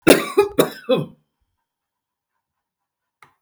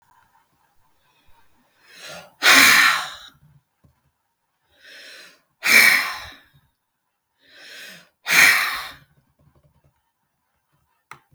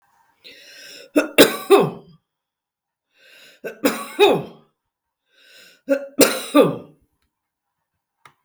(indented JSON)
{
  "cough_length": "3.4 s",
  "cough_amplitude": 32768,
  "cough_signal_mean_std_ratio": 0.29,
  "exhalation_length": "11.3 s",
  "exhalation_amplitude": 32768,
  "exhalation_signal_mean_std_ratio": 0.31,
  "three_cough_length": "8.4 s",
  "three_cough_amplitude": 32768,
  "three_cough_signal_mean_std_ratio": 0.32,
  "survey_phase": "beta (2021-08-13 to 2022-03-07)",
  "age": "65+",
  "gender": "Female",
  "wearing_mask": "No",
  "symptom_none": true,
  "smoker_status": "Never smoked",
  "respiratory_condition_asthma": false,
  "respiratory_condition_other": false,
  "recruitment_source": "REACT",
  "submission_delay": "2 days",
  "covid_test_result": "Negative",
  "covid_test_method": "RT-qPCR",
  "influenza_a_test_result": "Negative",
  "influenza_b_test_result": "Negative"
}